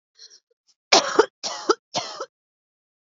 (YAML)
three_cough_length: 3.2 s
three_cough_amplitude: 29123
three_cough_signal_mean_std_ratio: 0.29
survey_phase: beta (2021-08-13 to 2022-03-07)
age: 18-44
gender: Female
wearing_mask: 'No'
symptom_runny_or_blocked_nose: true
symptom_sore_throat: true
symptom_onset: 13 days
smoker_status: Never smoked
respiratory_condition_asthma: true
respiratory_condition_other: false
recruitment_source: REACT
submission_delay: 1 day
covid_test_result: Negative
covid_test_method: RT-qPCR
influenza_a_test_result: Negative
influenza_b_test_result: Negative